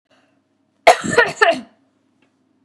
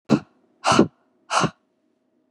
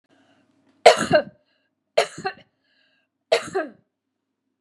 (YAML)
cough_length: 2.6 s
cough_amplitude: 32768
cough_signal_mean_std_ratio: 0.32
exhalation_length: 2.3 s
exhalation_amplitude: 28405
exhalation_signal_mean_std_ratio: 0.34
three_cough_length: 4.6 s
three_cough_amplitude: 32767
three_cough_signal_mean_std_ratio: 0.26
survey_phase: beta (2021-08-13 to 2022-03-07)
age: 45-64
gender: Female
wearing_mask: 'No'
symptom_shortness_of_breath: true
symptom_fatigue: true
smoker_status: Never smoked
respiratory_condition_asthma: true
respiratory_condition_other: false
recruitment_source: Test and Trace
submission_delay: 1 day
covid_test_result: Negative
covid_test_method: RT-qPCR